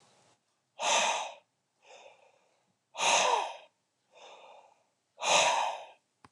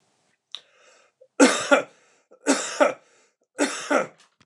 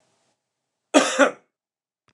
{"exhalation_length": "6.3 s", "exhalation_amplitude": 7728, "exhalation_signal_mean_std_ratio": 0.42, "three_cough_length": "4.5 s", "three_cough_amplitude": 26366, "three_cough_signal_mean_std_ratio": 0.36, "cough_length": "2.1 s", "cough_amplitude": 27344, "cough_signal_mean_std_ratio": 0.28, "survey_phase": "beta (2021-08-13 to 2022-03-07)", "age": "45-64", "gender": "Male", "wearing_mask": "No", "symptom_headache": true, "symptom_onset": "5 days", "smoker_status": "Ex-smoker", "respiratory_condition_asthma": false, "respiratory_condition_other": false, "recruitment_source": "REACT", "submission_delay": "1 day", "covid_test_result": "Negative", "covid_test_method": "RT-qPCR"}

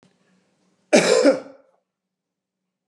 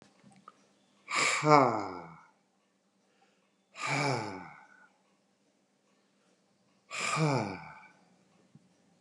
{"cough_length": "2.9 s", "cough_amplitude": 27095, "cough_signal_mean_std_ratio": 0.31, "exhalation_length": "9.0 s", "exhalation_amplitude": 18718, "exhalation_signal_mean_std_ratio": 0.34, "survey_phase": "alpha (2021-03-01 to 2021-08-12)", "age": "45-64", "gender": "Male", "wearing_mask": "No", "symptom_none": true, "smoker_status": "Never smoked", "respiratory_condition_asthma": false, "respiratory_condition_other": false, "recruitment_source": "REACT", "submission_delay": "4 days", "covid_test_method": "RT-qPCR", "covid_ct_value": 38.0, "covid_ct_gene": "N gene"}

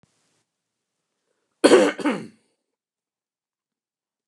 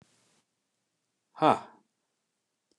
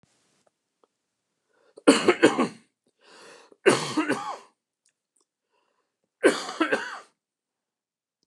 {"cough_length": "4.3 s", "cough_amplitude": 28220, "cough_signal_mean_std_ratio": 0.23, "exhalation_length": "2.8 s", "exhalation_amplitude": 13201, "exhalation_signal_mean_std_ratio": 0.17, "three_cough_length": "8.3 s", "three_cough_amplitude": 26841, "three_cough_signal_mean_std_ratio": 0.3, "survey_phase": "beta (2021-08-13 to 2022-03-07)", "age": "65+", "gender": "Male", "wearing_mask": "No", "symptom_cough_any": true, "symptom_sore_throat": true, "symptom_onset": "12 days", "smoker_status": "Never smoked", "respiratory_condition_asthma": false, "respiratory_condition_other": false, "recruitment_source": "REACT", "submission_delay": "1 day", "covid_test_result": "Negative", "covid_test_method": "RT-qPCR"}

